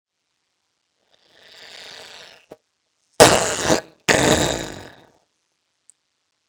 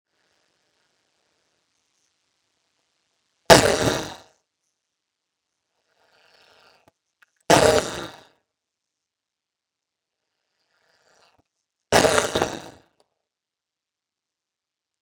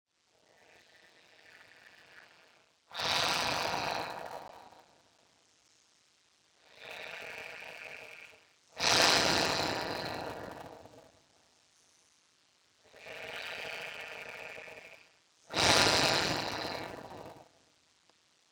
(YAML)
cough_length: 6.5 s
cough_amplitude: 32768
cough_signal_mean_std_ratio: 0.23
three_cough_length: 15.0 s
three_cough_amplitude: 32768
three_cough_signal_mean_std_ratio: 0.17
exhalation_length: 18.5 s
exhalation_amplitude: 10664
exhalation_signal_mean_std_ratio: 0.32
survey_phase: beta (2021-08-13 to 2022-03-07)
age: 45-64
gender: Male
wearing_mask: 'No'
symptom_cough_any: true
symptom_runny_or_blocked_nose: true
symptom_sore_throat: true
symptom_fatigue: true
smoker_status: Ex-smoker
respiratory_condition_asthma: false
respiratory_condition_other: false
recruitment_source: Test and Trace
submission_delay: 2 days
covid_test_result: Positive
covid_test_method: LFT